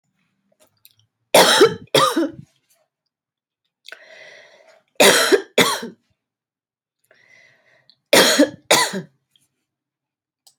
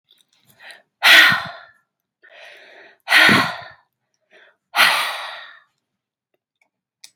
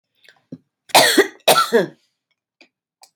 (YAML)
three_cough_length: 10.6 s
three_cough_amplitude: 31962
three_cough_signal_mean_std_ratio: 0.34
exhalation_length: 7.2 s
exhalation_amplitude: 32406
exhalation_signal_mean_std_ratio: 0.33
cough_length: 3.2 s
cough_amplitude: 32591
cough_signal_mean_std_ratio: 0.36
survey_phase: beta (2021-08-13 to 2022-03-07)
age: 45-64
gender: Female
wearing_mask: 'No'
symptom_none: true
smoker_status: Current smoker (1 to 10 cigarettes per day)
respiratory_condition_asthma: false
respiratory_condition_other: false
recruitment_source: REACT
submission_delay: 2 days
covid_test_result: Negative
covid_test_method: RT-qPCR